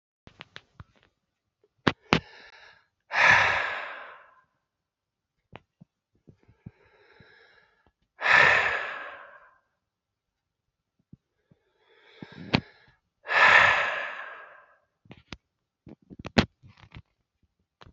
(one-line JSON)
{"exhalation_length": "17.9 s", "exhalation_amplitude": 28203, "exhalation_signal_mean_std_ratio": 0.29, "survey_phase": "beta (2021-08-13 to 2022-03-07)", "age": "45-64", "gender": "Male", "wearing_mask": "No", "symptom_cough_any": true, "symptom_runny_or_blocked_nose": true, "symptom_change_to_sense_of_smell_or_taste": true, "symptom_loss_of_taste": true, "smoker_status": "Never smoked", "respiratory_condition_asthma": false, "respiratory_condition_other": false, "recruitment_source": "Test and Trace", "submission_delay": "2 days", "covid_test_result": "Positive", "covid_test_method": "LFT"}